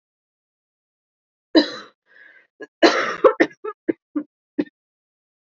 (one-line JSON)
{"three_cough_length": "5.5 s", "three_cough_amplitude": 27835, "three_cough_signal_mean_std_ratio": 0.27, "survey_phase": "alpha (2021-03-01 to 2021-08-12)", "age": "18-44", "gender": "Female", "wearing_mask": "No", "symptom_new_continuous_cough": true, "symptom_shortness_of_breath": true, "symptom_fatigue": true, "symptom_change_to_sense_of_smell_or_taste": true, "symptom_loss_of_taste": true, "symptom_onset": "3 days", "smoker_status": "Never smoked", "respiratory_condition_asthma": false, "respiratory_condition_other": false, "recruitment_source": "Test and Trace", "submission_delay": "1 day", "covid_test_result": "Positive", "covid_test_method": "RT-qPCR", "covid_ct_value": 11.7, "covid_ct_gene": "ORF1ab gene", "covid_ct_mean": 12.0, "covid_viral_load": "120000000 copies/ml", "covid_viral_load_category": "High viral load (>1M copies/ml)"}